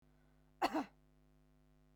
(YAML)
cough_length: 2.0 s
cough_amplitude: 2838
cough_signal_mean_std_ratio: 0.29
survey_phase: beta (2021-08-13 to 2022-03-07)
age: 18-44
gender: Female
wearing_mask: 'No'
symptom_none: true
symptom_onset: 4 days
smoker_status: Never smoked
respiratory_condition_asthma: true
respiratory_condition_other: false
recruitment_source: REACT
submission_delay: 2 days
covid_test_result: Negative
covid_test_method: RT-qPCR
influenza_a_test_result: Negative
influenza_b_test_result: Negative